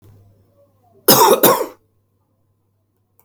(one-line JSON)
{"cough_length": "3.2 s", "cough_amplitude": 32768, "cough_signal_mean_std_ratio": 0.33, "survey_phase": "alpha (2021-03-01 to 2021-08-12)", "age": "45-64", "gender": "Male", "wearing_mask": "No", "symptom_none": true, "symptom_fatigue": true, "smoker_status": "Never smoked", "respiratory_condition_asthma": true, "respiratory_condition_other": false, "recruitment_source": "REACT", "submission_delay": "2 days", "covid_test_result": "Negative", "covid_test_method": "RT-qPCR"}